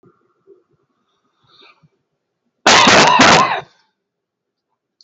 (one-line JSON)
{"cough_length": "5.0 s", "cough_amplitude": 32768, "cough_signal_mean_std_ratio": 0.37, "survey_phase": "beta (2021-08-13 to 2022-03-07)", "age": "65+", "gender": "Male", "wearing_mask": "No", "symptom_none": true, "smoker_status": "Never smoked", "respiratory_condition_asthma": true, "respiratory_condition_other": false, "recruitment_source": "REACT", "submission_delay": "2 days", "covid_test_result": "Negative", "covid_test_method": "RT-qPCR", "influenza_a_test_result": "Negative", "influenza_b_test_result": "Negative"}